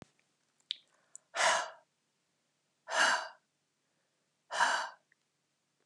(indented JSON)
{
  "exhalation_length": "5.9 s",
  "exhalation_amplitude": 5750,
  "exhalation_signal_mean_std_ratio": 0.33,
  "survey_phase": "alpha (2021-03-01 to 2021-08-12)",
  "age": "65+",
  "gender": "Female",
  "wearing_mask": "No",
  "symptom_none": true,
  "smoker_status": "Never smoked",
  "respiratory_condition_asthma": false,
  "respiratory_condition_other": false,
  "recruitment_source": "REACT",
  "submission_delay": "1 day",
  "covid_test_result": "Negative",
  "covid_test_method": "RT-qPCR"
}